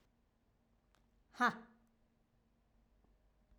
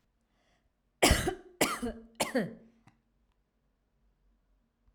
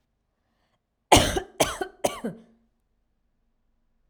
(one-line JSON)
{"exhalation_length": "3.6 s", "exhalation_amplitude": 3062, "exhalation_signal_mean_std_ratio": 0.18, "three_cough_length": "4.9 s", "three_cough_amplitude": 12493, "three_cough_signal_mean_std_ratio": 0.3, "cough_length": "4.1 s", "cough_amplitude": 32767, "cough_signal_mean_std_ratio": 0.26, "survey_phase": "alpha (2021-03-01 to 2021-08-12)", "age": "18-44", "gender": "Female", "wearing_mask": "No", "symptom_none": true, "smoker_status": "Never smoked", "respiratory_condition_asthma": false, "respiratory_condition_other": false, "recruitment_source": "REACT", "submission_delay": "2 days", "covid_test_result": "Negative", "covid_test_method": "RT-qPCR"}